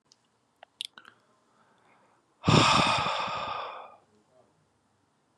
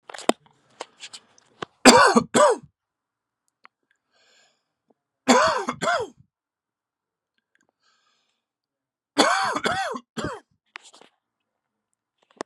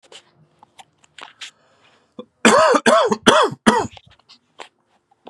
{
  "exhalation_length": "5.4 s",
  "exhalation_amplitude": 13932,
  "exhalation_signal_mean_std_ratio": 0.36,
  "three_cough_length": "12.5 s",
  "three_cough_amplitude": 32768,
  "three_cough_signal_mean_std_ratio": 0.29,
  "cough_length": "5.3 s",
  "cough_amplitude": 32768,
  "cough_signal_mean_std_ratio": 0.37,
  "survey_phase": "beta (2021-08-13 to 2022-03-07)",
  "age": "18-44",
  "gender": "Male",
  "wearing_mask": "No",
  "symptom_none": true,
  "smoker_status": "Current smoker (e-cigarettes or vapes only)",
  "respiratory_condition_asthma": false,
  "respiratory_condition_other": false,
  "recruitment_source": "Test and Trace",
  "submission_delay": "1 day",
  "covid_test_result": "Positive",
  "covid_test_method": "RT-qPCR",
  "covid_ct_value": 28.6,
  "covid_ct_gene": "N gene"
}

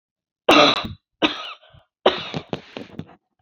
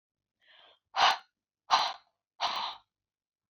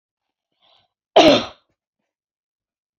{
  "three_cough_length": "3.4 s",
  "three_cough_amplitude": 29044,
  "three_cough_signal_mean_std_ratio": 0.35,
  "exhalation_length": "3.5 s",
  "exhalation_amplitude": 11480,
  "exhalation_signal_mean_std_ratio": 0.33,
  "cough_length": "3.0 s",
  "cough_amplitude": 28739,
  "cough_signal_mean_std_ratio": 0.24,
  "survey_phase": "beta (2021-08-13 to 2022-03-07)",
  "age": "18-44",
  "gender": "Female",
  "wearing_mask": "No",
  "symptom_none": true,
  "smoker_status": "Never smoked",
  "respiratory_condition_asthma": false,
  "respiratory_condition_other": false,
  "recruitment_source": "REACT",
  "submission_delay": "1 day",
  "covid_test_result": "Negative",
  "covid_test_method": "RT-qPCR"
}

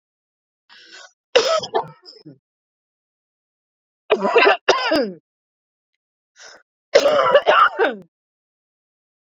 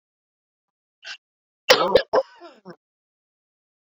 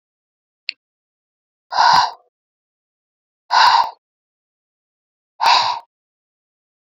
{
  "three_cough_length": "9.3 s",
  "three_cough_amplitude": 30273,
  "three_cough_signal_mean_std_ratio": 0.37,
  "cough_length": "3.9 s",
  "cough_amplitude": 30394,
  "cough_signal_mean_std_ratio": 0.24,
  "exhalation_length": "7.0 s",
  "exhalation_amplitude": 30565,
  "exhalation_signal_mean_std_ratio": 0.32,
  "survey_phase": "beta (2021-08-13 to 2022-03-07)",
  "age": "45-64",
  "gender": "Female",
  "wearing_mask": "No",
  "symptom_none": true,
  "smoker_status": "Never smoked",
  "respiratory_condition_asthma": false,
  "respiratory_condition_other": false,
  "recruitment_source": "REACT",
  "submission_delay": "2 days",
  "covid_test_result": "Negative",
  "covid_test_method": "RT-qPCR"
}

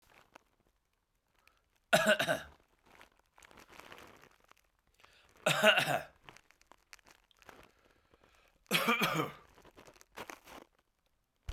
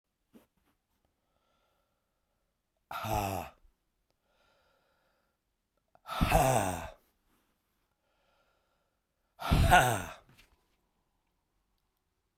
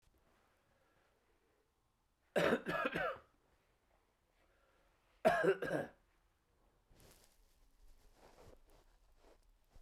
{
  "three_cough_length": "11.5 s",
  "three_cough_amplitude": 10605,
  "three_cough_signal_mean_std_ratio": 0.3,
  "exhalation_length": "12.4 s",
  "exhalation_amplitude": 13183,
  "exhalation_signal_mean_std_ratio": 0.28,
  "cough_length": "9.8 s",
  "cough_amplitude": 4087,
  "cough_signal_mean_std_ratio": 0.3,
  "survey_phase": "beta (2021-08-13 to 2022-03-07)",
  "age": "45-64",
  "gender": "Male",
  "wearing_mask": "No",
  "symptom_cough_any": true,
  "symptom_runny_or_blocked_nose": true,
  "symptom_sore_throat": true,
  "symptom_headache": true,
  "smoker_status": "Ex-smoker",
  "respiratory_condition_asthma": false,
  "respiratory_condition_other": false,
  "recruitment_source": "Test and Trace",
  "submission_delay": "2 days",
  "covid_test_result": "Positive",
  "covid_test_method": "RT-qPCR"
}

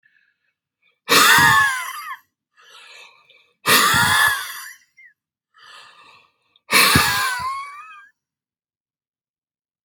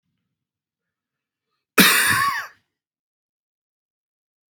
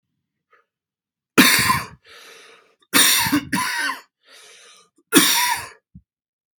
{
  "exhalation_length": "9.8 s",
  "exhalation_amplitude": 32687,
  "exhalation_signal_mean_std_ratio": 0.42,
  "cough_length": "4.6 s",
  "cough_amplitude": 32767,
  "cough_signal_mean_std_ratio": 0.28,
  "three_cough_length": "6.6 s",
  "three_cough_amplitude": 32768,
  "three_cough_signal_mean_std_ratio": 0.42,
  "survey_phase": "beta (2021-08-13 to 2022-03-07)",
  "age": "45-64",
  "gender": "Male",
  "wearing_mask": "No",
  "symptom_cough_any": true,
  "symptom_new_continuous_cough": true,
  "symptom_headache": true,
  "symptom_other": true,
  "symptom_onset": "3 days",
  "smoker_status": "Never smoked",
  "respiratory_condition_asthma": false,
  "respiratory_condition_other": false,
  "recruitment_source": "Test and Trace",
  "submission_delay": "1 day",
  "covid_test_result": "Positive",
  "covid_test_method": "RT-qPCR"
}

